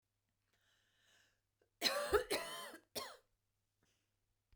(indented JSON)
{
  "cough_length": "4.6 s",
  "cough_amplitude": 2920,
  "cough_signal_mean_std_ratio": 0.32,
  "survey_phase": "beta (2021-08-13 to 2022-03-07)",
  "age": "45-64",
  "gender": "Female",
  "wearing_mask": "No",
  "symptom_none": true,
  "smoker_status": "Ex-smoker",
  "respiratory_condition_asthma": false,
  "respiratory_condition_other": false,
  "recruitment_source": "REACT",
  "submission_delay": "1 day",
  "covid_test_result": "Negative",
  "covid_test_method": "RT-qPCR"
}